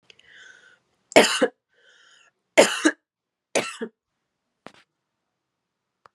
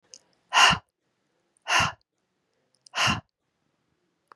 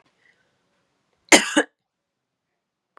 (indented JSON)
{
  "three_cough_length": "6.1 s",
  "three_cough_amplitude": 31358,
  "three_cough_signal_mean_std_ratio": 0.24,
  "exhalation_length": "4.4 s",
  "exhalation_amplitude": 19137,
  "exhalation_signal_mean_std_ratio": 0.3,
  "cough_length": "3.0 s",
  "cough_amplitude": 32767,
  "cough_signal_mean_std_ratio": 0.19,
  "survey_phase": "beta (2021-08-13 to 2022-03-07)",
  "age": "18-44",
  "gender": "Female",
  "wearing_mask": "No",
  "symptom_cough_any": true,
  "symptom_new_continuous_cough": true,
  "symptom_runny_or_blocked_nose": true,
  "symptom_sore_throat": true,
  "symptom_fatigue": true,
  "symptom_headache": true,
  "symptom_change_to_sense_of_smell_or_taste": true,
  "symptom_onset": "4 days",
  "smoker_status": "Never smoked",
  "respiratory_condition_asthma": false,
  "respiratory_condition_other": false,
  "recruitment_source": "Test and Trace",
  "submission_delay": "2 days",
  "covid_test_result": "Positive",
  "covid_test_method": "RT-qPCR",
  "covid_ct_value": 16.9,
  "covid_ct_gene": "ORF1ab gene",
  "covid_ct_mean": 17.0,
  "covid_viral_load": "2700000 copies/ml",
  "covid_viral_load_category": "High viral load (>1M copies/ml)"
}